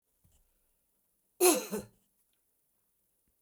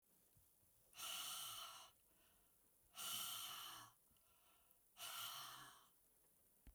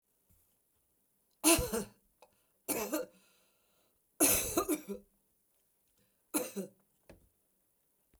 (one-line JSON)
{"cough_length": "3.4 s", "cough_amplitude": 8849, "cough_signal_mean_std_ratio": 0.23, "exhalation_length": "6.7 s", "exhalation_amplitude": 615, "exhalation_signal_mean_std_ratio": 0.6, "three_cough_length": "8.2 s", "three_cough_amplitude": 9200, "three_cough_signal_mean_std_ratio": 0.32, "survey_phase": "beta (2021-08-13 to 2022-03-07)", "age": "65+", "gender": "Female", "wearing_mask": "No", "symptom_cough_any": true, "smoker_status": "Never smoked", "respiratory_condition_asthma": false, "respiratory_condition_other": false, "recruitment_source": "REACT", "submission_delay": "1 day", "covid_test_result": "Negative", "covid_test_method": "RT-qPCR"}